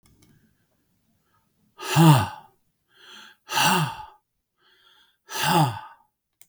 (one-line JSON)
{"exhalation_length": "6.5 s", "exhalation_amplitude": 26067, "exhalation_signal_mean_std_ratio": 0.34, "survey_phase": "beta (2021-08-13 to 2022-03-07)", "age": "65+", "gender": "Male", "wearing_mask": "No", "symptom_none": true, "smoker_status": "Never smoked", "respiratory_condition_asthma": false, "respiratory_condition_other": false, "recruitment_source": "REACT", "submission_delay": "2 days", "covid_test_result": "Negative", "covid_test_method": "RT-qPCR", "influenza_a_test_result": "Negative", "influenza_b_test_result": "Negative"}